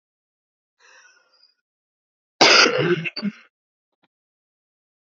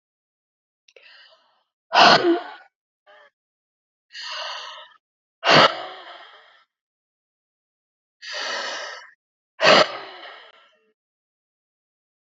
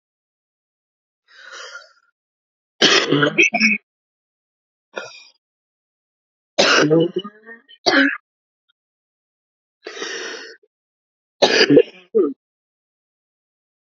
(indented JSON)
{
  "cough_length": "5.1 s",
  "cough_amplitude": 32767,
  "cough_signal_mean_std_ratio": 0.28,
  "exhalation_length": "12.4 s",
  "exhalation_amplitude": 28097,
  "exhalation_signal_mean_std_ratio": 0.28,
  "three_cough_length": "13.8 s",
  "three_cough_amplitude": 32768,
  "three_cough_signal_mean_std_ratio": 0.34,
  "survey_phase": "alpha (2021-03-01 to 2021-08-12)",
  "age": "45-64",
  "gender": "Female",
  "wearing_mask": "No",
  "symptom_cough_any": true,
  "symptom_shortness_of_breath": true,
  "symptom_fatigue": true,
  "symptom_headache": true,
  "symptom_change_to_sense_of_smell_or_taste": true,
  "symptom_onset": "4 days",
  "smoker_status": "Current smoker (1 to 10 cigarettes per day)",
  "respiratory_condition_asthma": true,
  "respiratory_condition_other": false,
  "recruitment_source": "Test and Trace",
  "submission_delay": "2 days",
  "covid_test_result": "Positive",
  "covid_test_method": "RT-qPCR",
  "covid_ct_value": 18.8,
  "covid_ct_gene": "ORF1ab gene"
}